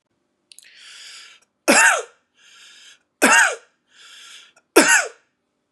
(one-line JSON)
{"three_cough_length": "5.7 s", "three_cough_amplitude": 32767, "three_cough_signal_mean_std_ratio": 0.34, "survey_phase": "beta (2021-08-13 to 2022-03-07)", "age": "18-44", "gender": "Male", "wearing_mask": "No", "symptom_none": true, "smoker_status": "Current smoker (1 to 10 cigarettes per day)", "respiratory_condition_asthma": false, "respiratory_condition_other": false, "recruitment_source": "REACT", "submission_delay": "1 day", "covid_test_result": "Negative", "covid_test_method": "RT-qPCR", "influenza_a_test_result": "Negative", "influenza_b_test_result": "Negative"}